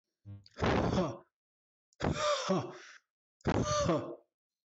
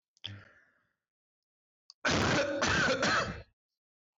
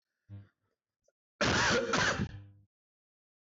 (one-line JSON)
{"exhalation_length": "4.7 s", "exhalation_amplitude": 4068, "exhalation_signal_mean_std_ratio": 0.55, "three_cough_length": "4.2 s", "three_cough_amplitude": 3938, "three_cough_signal_mean_std_ratio": 0.52, "cough_length": "3.5 s", "cough_amplitude": 3988, "cough_signal_mean_std_ratio": 0.46, "survey_phase": "beta (2021-08-13 to 2022-03-07)", "age": "18-44", "gender": "Male", "wearing_mask": "No", "symptom_cough_any": true, "symptom_sore_throat": true, "smoker_status": "Ex-smoker", "respiratory_condition_asthma": false, "respiratory_condition_other": false, "recruitment_source": "Test and Trace", "submission_delay": "0 days", "covid_test_result": "Negative", "covid_test_method": "LFT"}